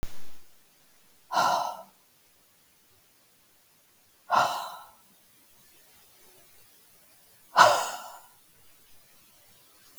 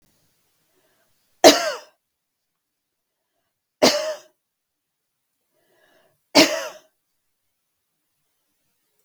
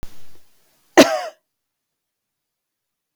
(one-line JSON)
{"exhalation_length": "10.0 s", "exhalation_amplitude": 23563, "exhalation_signal_mean_std_ratio": 0.31, "three_cough_length": "9.0 s", "three_cough_amplitude": 32768, "three_cough_signal_mean_std_ratio": 0.2, "cough_length": "3.2 s", "cough_amplitude": 32768, "cough_signal_mean_std_ratio": 0.24, "survey_phase": "beta (2021-08-13 to 2022-03-07)", "age": "45-64", "gender": "Female", "wearing_mask": "No", "symptom_none": true, "smoker_status": "Never smoked", "respiratory_condition_asthma": false, "respiratory_condition_other": false, "recruitment_source": "REACT", "submission_delay": "2 days", "covid_test_result": "Negative", "covid_test_method": "RT-qPCR", "influenza_a_test_result": "Negative", "influenza_b_test_result": "Negative"}